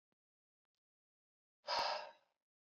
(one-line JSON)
{"exhalation_length": "2.7 s", "exhalation_amplitude": 1503, "exhalation_signal_mean_std_ratio": 0.3, "survey_phase": "beta (2021-08-13 to 2022-03-07)", "age": "18-44", "gender": "Male", "wearing_mask": "No", "symptom_runny_or_blocked_nose": true, "symptom_sore_throat": true, "symptom_fatigue": true, "symptom_headache": true, "smoker_status": "Never smoked", "respiratory_condition_asthma": false, "respiratory_condition_other": false, "recruitment_source": "Test and Trace", "submission_delay": "2 days", "covid_test_result": "Positive", "covid_test_method": "LFT"}